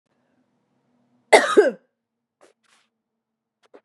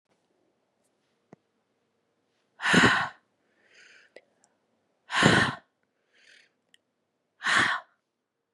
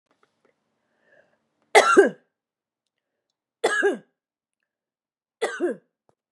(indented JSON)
{
  "cough_length": "3.8 s",
  "cough_amplitude": 32756,
  "cough_signal_mean_std_ratio": 0.22,
  "exhalation_length": "8.5 s",
  "exhalation_amplitude": 23790,
  "exhalation_signal_mean_std_ratio": 0.29,
  "three_cough_length": "6.3 s",
  "three_cough_amplitude": 30173,
  "three_cough_signal_mean_std_ratio": 0.27,
  "survey_phase": "beta (2021-08-13 to 2022-03-07)",
  "age": "45-64",
  "gender": "Female",
  "wearing_mask": "No",
  "symptom_cough_any": true,
  "symptom_new_continuous_cough": true,
  "symptom_runny_or_blocked_nose": true,
  "symptom_sore_throat": true,
  "symptom_fatigue": true,
  "symptom_fever_high_temperature": true,
  "symptom_headache": true,
  "symptom_change_to_sense_of_smell_or_taste": true,
  "symptom_loss_of_taste": true,
  "symptom_other": true,
  "symptom_onset": "2 days",
  "smoker_status": "Never smoked",
  "respiratory_condition_asthma": false,
  "respiratory_condition_other": false,
  "recruitment_source": "Test and Trace",
  "submission_delay": "1 day",
  "covid_test_result": "Positive",
  "covid_test_method": "RT-qPCR",
  "covid_ct_value": 23.1,
  "covid_ct_gene": "N gene"
}